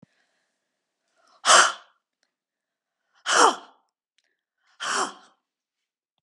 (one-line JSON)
{"exhalation_length": "6.2 s", "exhalation_amplitude": 27314, "exhalation_signal_mean_std_ratio": 0.26, "survey_phase": "beta (2021-08-13 to 2022-03-07)", "age": "45-64", "gender": "Female", "wearing_mask": "No", "symptom_cough_any": true, "symptom_runny_or_blocked_nose": true, "symptom_onset": "7 days", "smoker_status": "Ex-smoker", "respiratory_condition_asthma": false, "respiratory_condition_other": false, "recruitment_source": "Test and Trace", "submission_delay": "2 days", "covid_test_result": "Positive", "covid_test_method": "RT-qPCR", "covid_ct_value": 11.0, "covid_ct_gene": "ORF1ab gene", "covid_ct_mean": 11.1, "covid_viral_load": "220000000 copies/ml", "covid_viral_load_category": "High viral load (>1M copies/ml)"}